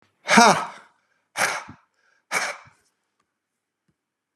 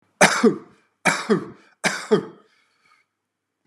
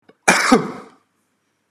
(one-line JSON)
{"exhalation_length": "4.4 s", "exhalation_amplitude": 32767, "exhalation_signal_mean_std_ratio": 0.28, "three_cough_length": "3.7 s", "three_cough_amplitude": 30812, "three_cough_signal_mean_std_ratio": 0.36, "cough_length": "1.7 s", "cough_amplitude": 32767, "cough_signal_mean_std_ratio": 0.37, "survey_phase": "beta (2021-08-13 to 2022-03-07)", "age": "65+", "gender": "Male", "wearing_mask": "No", "symptom_none": true, "smoker_status": "Never smoked", "respiratory_condition_asthma": false, "respiratory_condition_other": false, "recruitment_source": "REACT", "submission_delay": "1 day", "covid_test_result": "Negative", "covid_test_method": "RT-qPCR", "influenza_a_test_result": "Negative", "influenza_b_test_result": "Negative"}